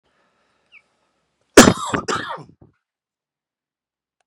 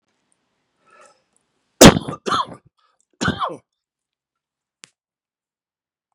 cough_length: 4.3 s
cough_amplitude: 32768
cough_signal_mean_std_ratio: 0.21
three_cough_length: 6.1 s
three_cough_amplitude: 32768
three_cough_signal_mean_std_ratio: 0.19
survey_phase: beta (2021-08-13 to 2022-03-07)
age: 45-64
gender: Male
wearing_mask: 'No'
symptom_none: true
smoker_status: Never smoked
respiratory_condition_asthma: false
respiratory_condition_other: false
recruitment_source: REACT
submission_delay: 3 days
covid_test_result: Negative
covid_test_method: RT-qPCR
influenza_a_test_result: Unknown/Void
influenza_b_test_result: Unknown/Void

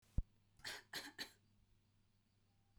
three_cough_length: 2.8 s
three_cough_amplitude: 2017
three_cough_signal_mean_std_ratio: 0.27
survey_phase: beta (2021-08-13 to 2022-03-07)
age: 18-44
gender: Female
wearing_mask: 'No'
symptom_none: true
smoker_status: Never smoked
respiratory_condition_asthma: false
respiratory_condition_other: false
recruitment_source: REACT
submission_delay: 1 day
covid_test_result: Negative
covid_test_method: RT-qPCR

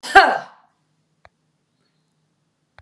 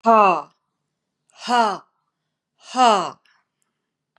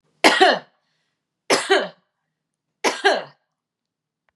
cough_length: 2.8 s
cough_amplitude: 32768
cough_signal_mean_std_ratio: 0.22
exhalation_length: 4.2 s
exhalation_amplitude: 27569
exhalation_signal_mean_std_ratio: 0.36
three_cough_length: 4.4 s
three_cough_amplitude: 32713
three_cough_signal_mean_std_ratio: 0.35
survey_phase: beta (2021-08-13 to 2022-03-07)
age: 45-64
gender: Female
wearing_mask: 'No'
symptom_none: true
symptom_onset: 12 days
smoker_status: Never smoked
respiratory_condition_asthma: false
respiratory_condition_other: false
recruitment_source: REACT
submission_delay: 3 days
covid_test_result: Negative
covid_test_method: RT-qPCR
influenza_a_test_result: Negative
influenza_b_test_result: Negative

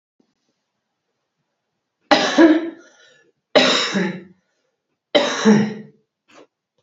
three_cough_length: 6.8 s
three_cough_amplitude: 32768
three_cough_signal_mean_std_ratio: 0.38
survey_phase: beta (2021-08-13 to 2022-03-07)
age: 45-64
gender: Female
wearing_mask: 'No'
symptom_cough_any: true
symptom_runny_or_blocked_nose: true
symptom_onset: 5 days
smoker_status: Never smoked
respiratory_condition_asthma: false
respiratory_condition_other: false
recruitment_source: Test and Trace
submission_delay: 1 day
covid_test_result: Positive
covid_test_method: RT-qPCR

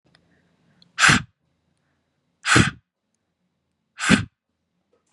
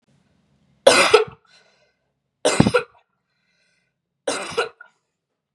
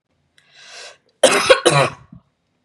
exhalation_length: 5.1 s
exhalation_amplitude: 31247
exhalation_signal_mean_std_ratio: 0.27
three_cough_length: 5.5 s
three_cough_amplitude: 32768
three_cough_signal_mean_std_ratio: 0.29
cough_length: 2.6 s
cough_amplitude: 32768
cough_signal_mean_std_ratio: 0.37
survey_phase: beta (2021-08-13 to 2022-03-07)
age: 18-44
gender: Female
wearing_mask: 'No'
symptom_cough_any: true
symptom_runny_or_blocked_nose: true
symptom_onset: 6 days
smoker_status: Never smoked
respiratory_condition_asthma: false
respiratory_condition_other: false
recruitment_source: Test and Trace
submission_delay: 2 days
covid_test_result: Positive
covid_test_method: RT-qPCR
covid_ct_value: 16.2
covid_ct_gene: N gene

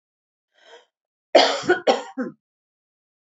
cough_length: 3.3 s
cough_amplitude: 27358
cough_signal_mean_std_ratio: 0.3
survey_phase: beta (2021-08-13 to 2022-03-07)
age: 45-64
gender: Female
wearing_mask: 'No'
symptom_none: true
smoker_status: Never smoked
respiratory_condition_asthma: false
respiratory_condition_other: false
recruitment_source: REACT
submission_delay: 1 day
covid_test_result: Negative
covid_test_method: RT-qPCR
influenza_a_test_result: Negative
influenza_b_test_result: Negative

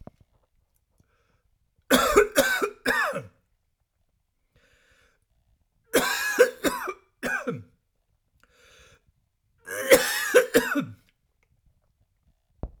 three_cough_length: 12.8 s
three_cough_amplitude: 31605
three_cough_signal_mean_std_ratio: 0.35
survey_phase: alpha (2021-03-01 to 2021-08-12)
age: 45-64
gender: Male
wearing_mask: 'No'
symptom_none: true
smoker_status: Ex-smoker
respiratory_condition_asthma: true
respiratory_condition_other: false
recruitment_source: REACT
submission_delay: 1 day
covid_test_result: Negative
covid_test_method: RT-qPCR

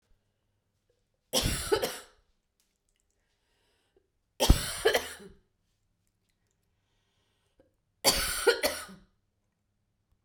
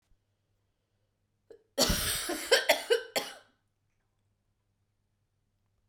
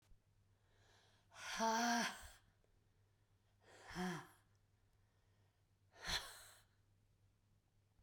three_cough_length: 10.2 s
three_cough_amplitude: 15105
three_cough_signal_mean_std_ratio: 0.29
cough_length: 5.9 s
cough_amplitude: 12095
cough_signal_mean_std_ratio: 0.32
exhalation_length: 8.0 s
exhalation_amplitude: 1532
exhalation_signal_mean_std_ratio: 0.35
survey_phase: beta (2021-08-13 to 2022-03-07)
age: 45-64
gender: Female
wearing_mask: 'No'
symptom_new_continuous_cough: true
symptom_runny_or_blocked_nose: true
symptom_sore_throat: true
symptom_fatigue: true
symptom_fever_high_temperature: true
symptom_headache: true
symptom_change_to_sense_of_smell_or_taste: true
symptom_loss_of_taste: true
smoker_status: Never smoked
respiratory_condition_asthma: false
respiratory_condition_other: false
recruitment_source: Test and Trace
submission_delay: 2 days
covid_test_result: Positive
covid_test_method: ePCR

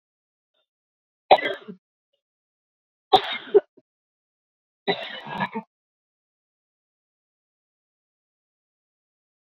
three_cough_length: 9.5 s
three_cough_amplitude: 27579
three_cough_signal_mean_std_ratio: 0.18
survey_phase: beta (2021-08-13 to 2022-03-07)
age: 45-64
gender: Female
wearing_mask: 'No'
symptom_headache: true
symptom_onset: 4 days
smoker_status: Never smoked
respiratory_condition_asthma: false
respiratory_condition_other: false
recruitment_source: Test and Trace
submission_delay: 3 days
covid_test_result: Negative
covid_test_method: RT-qPCR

